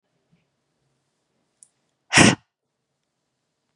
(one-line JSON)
{"exhalation_length": "3.8 s", "exhalation_amplitude": 30863, "exhalation_signal_mean_std_ratio": 0.18, "survey_phase": "beta (2021-08-13 to 2022-03-07)", "age": "18-44", "gender": "Female", "wearing_mask": "No", "symptom_none": true, "smoker_status": "Never smoked", "respiratory_condition_asthma": false, "respiratory_condition_other": false, "recruitment_source": "REACT", "submission_delay": "2 days", "covid_test_result": "Negative", "covid_test_method": "RT-qPCR", "influenza_a_test_result": "Unknown/Void", "influenza_b_test_result": "Unknown/Void"}